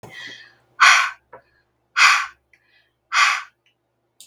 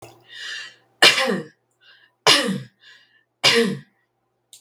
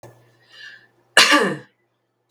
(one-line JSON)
{"exhalation_length": "4.3 s", "exhalation_amplitude": 32768, "exhalation_signal_mean_std_ratio": 0.36, "three_cough_length": "4.6 s", "three_cough_amplitude": 32768, "three_cough_signal_mean_std_ratio": 0.38, "cough_length": "2.3 s", "cough_amplitude": 32768, "cough_signal_mean_std_ratio": 0.32, "survey_phase": "beta (2021-08-13 to 2022-03-07)", "age": "45-64", "gender": "Female", "wearing_mask": "No", "symptom_none": true, "symptom_onset": "12 days", "smoker_status": "Never smoked", "respiratory_condition_asthma": false, "respiratory_condition_other": false, "recruitment_source": "REACT", "submission_delay": "1 day", "covid_test_result": "Negative", "covid_test_method": "RT-qPCR"}